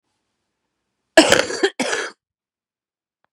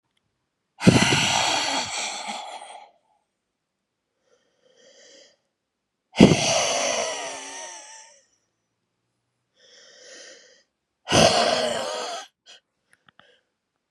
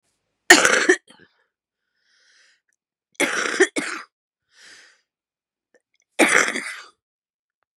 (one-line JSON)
{"cough_length": "3.3 s", "cough_amplitude": 32768, "cough_signal_mean_std_ratio": 0.29, "exhalation_length": "13.9 s", "exhalation_amplitude": 32768, "exhalation_signal_mean_std_ratio": 0.37, "three_cough_length": "7.8 s", "three_cough_amplitude": 32768, "three_cough_signal_mean_std_ratio": 0.29, "survey_phase": "beta (2021-08-13 to 2022-03-07)", "age": "65+", "gender": "Female", "wearing_mask": "No", "symptom_cough_any": true, "symptom_runny_or_blocked_nose": true, "symptom_shortness_of_breath": true, "symptom_sore_throat": true, "symptom_fatigue": true, "symptom_onset": "4 days", "smoker_status": "Ex-smoker", "respiratory_condition_asthma": false, "respiratory_condition_other": false, "recruitment_source": "Test and Trace", "submission_delay": "2 days", "covid_test_result": "Positive", "covid_test_method": "RT-qPCR", "covid_ct_value": 13.2, "covid_ct_gene": "ORF1ab gene"}